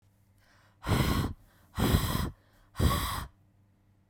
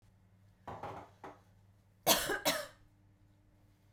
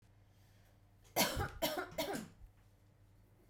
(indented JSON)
{
  "exhalation_length": "4.1 s",
  "exhalation_amplitude": 10116,
  "exhalation_signal_mean_std_ratio": 0.5,
  "cough_length": "3.9 s",
  "cough_amplitude": 8203,
  "cough_signal_mean_std_ratio": 0.34,
  "three_cough_length": "3.5 s",
  "three_cough_amplitude": 4433,
  "three_cough_signal_mean_std_ratio": 0.44,
  "survey_phase": "beta (2021-08-13 to 2022-03-07)",
  "age": "18-44",
  "gender": "Female",
  "wearing_mask": "No",
  "symptom_abdominal_pain": true,
  "symptom_onset": "8 days",
  "smoker_status": "Never smoked",
  "respiratory_condition_asthma": false,
  "respiratory_condition_other": false,
  "recruitment_source": "REACT",
  "submission_delay": "3 days",
  "covid_test_result": "Negative",
  "covid_test_method": "RT-qPCR",
  "influenza_a_test_result": "Negative",
  "influenza_b_test_result": "Negative"
}